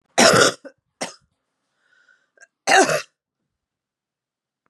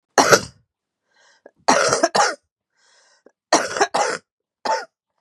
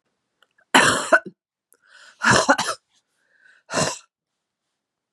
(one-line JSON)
{"cough_length": "4.7 s", "cough_amplitude": 30559, "cough_signal_mean_std_ratio": 0.3, "three_cough_length": "5.2 s", "three_cough_amplitude": 32768, "three_cough_signal_mean_std_ratio": 0.39, "exhalation_length": "5.1 s", "exhalation_amplitude": 31859, "exhalation_signal_mean_std_ratio": 0.33, "survey_phase": "beta (2021-08-13 to 2022-03-07)", "age": "45-64", "gender": "Female", "wearing_mask": "No", "symptom_cough_any": true, "symptom_runny_or_blocked_nose": true, "symptom_fatigue": true, "symptom_change_to_sense_of_smell_or_taste": true, "symptom_onset": "8 days", "smoker_status": "Never smoked", "respiratory_condition_asthma": false, "respiratory_condition_other": false, "recruitment_source": "Test and Trace", "submission_delay": "3 days", "covid_test_result": "Positive", "covid_test_method": "ePCR"}